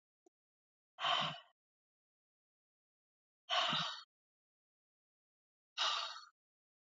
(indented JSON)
{
  "exhalation_length": "6.9 s",
  "exhalation_amplitude": 2641,
  "exhalation_signal_mean_std_ratio": 0.33,
  "survey_phase": "beta (2021-08-13 to 2022-03-07)",
  "age": "18-44",
  "gender": "Female",
  "wearing_mask": "No",
  "symptom_none": true,
  "smoker_status": "Never smoked",
  "respiratory_condition_asthma": true,
  "respiratory_condition_other": false,
  "recruitment_source": "REACT",
  "submission_delay": "1 day",
  "covid_test_result": "Negative",
  "covid_test_method": "RT-qPCR",
  "influenza_a_test_result": "Negative",
  "influenza_b_test_result": "Negative"
}